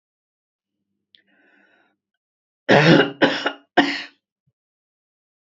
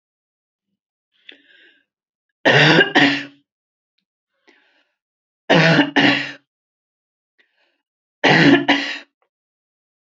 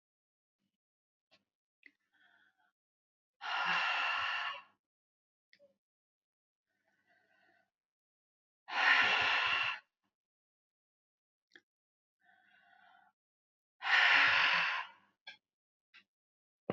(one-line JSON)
{"cough_length": "5.5 s", "cough_amplitude": 31956, "cough_signal_mean_std_ratio": 0.29, "three_cough_length": "10.2 s", "three_cough_amplitude": 30709, "three_cough_signal_mean_std_ratio": 0.36, "exhalation_length": "16.7 s", "exhalation_amplitude": 6409, "exhalation_signal_mean_std_ratio": 0.34, "survey_phase": "alpha (2021-03-01 to 2021-08-12)", "age": "65+", "gender": "Female", "wearing_mask": "No", "symptom_none": true, "smoker_status": "Never smoked", "respiratory_condition_asthma": false, "respiratory_condition_other": false, "recruitment_source": "REACT", "submission_delay": "1 day", "covid_test_result": "Negative", "covid_test_method": "RT-qPCR"}